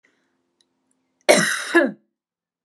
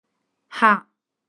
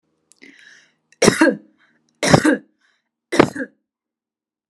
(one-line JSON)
{"cough_length": "2.6 s", "cough_amplitude": 32380, "cough_signal_mean_std_ratio": 0.33, "exhalation_length": "1.3 s", "exhalation_amplitude": 28279, "exhalation_signal_mean_std_ratio": 0.28, "three_cough_length": "4.7 s", "three_cough_amplitude": 32768, "three_cough_signal_mean_std_ratio": 0.3, "survey_phase": "alpha (2021-03-01 to 2021-08-12)", "age": "18-44", "gender": "Female", "wearing_mask": "No", "symptom_none": true, "smoker_status": "Ex-smoker", "respiratory_condition_asthma": false, "respiratory_condition_other": false, "recruitment_source": "REACT", "submission_delay": "1 day", "covid_test_result": "Negative", "covid_test_method": "RT-qPCR"}